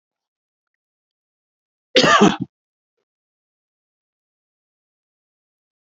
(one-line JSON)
{"cough_length": "5.8 s", "cough_amplitude": 29969, "cough_signal_mean_std_ratio": 0.21, "survey_phase": "alpha (2021-03-01 to 2021-08-12)", "age": "65+", "gender": "Male", "wearing_mask": "No", "symptom_none": true, "smoker_status": "Never smoked", "respiratory_condition_asthma": false, "respiratory_condition_other": false, "recruitment_source": "REACT", "submission_delay": "1 day", "covid_test_result": "Negative", "covid_test_method": "RT-qPCR"}